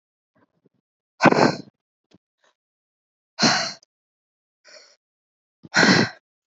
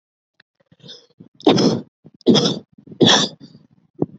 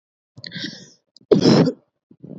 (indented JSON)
{
  "exhalation_length": "6.5 s",
  "exhalation_amplitude": 27565,
  "exhalation_signal_mean_std_ratio": 0.29,
  "three_cough_length": "4.2 s",
  "three_cough_amplitude": 30958,
  "three_cough_signal_mean_std_ratio": 0.39,
  "cough_length": "2.4 s",
  "cough_amplitude": 26609,
  "cough_signal_mean_std_ratio": 0.37,
  "survey_phase": "alpha (2021-03-01 to 2021-08-12)",
  "age": "18-44",
  "gender": "Female",
  "wearing_mask": "No",
  "symptom_cough_any": true,
  "symptom_shortness_of_breath": true,
  "symptom_diarrhoea": true,
  "symptom_fever_high_temperature": true,
  "symptom_headache": true,
  "symptom_change_to_sense_of_smell_or_taste": true,
  "symptom_loss_of_taste": true,
  "symptom_onset": "4 days",
  "smoker_status": "Never smoked",
  "respiratory_condition_asthma": false,
  "respiratory_condition_other": false,
  "recruitment_source": "Test and Trace",
  "submission_delay": "1 day",
  "covid_test_result": "Positive",
  "covid_test_method": "RT-qPCR",
  "covid_ct_value": 14.8,
  "covid_ct_gene": "ORF1ab gene",
  "covid_ct_mean": 15.1,
  "covid_viral_load": "11000000 copies/ml",
  "covid_viral_load_category": "High viral load (>1M copies/ml)"
}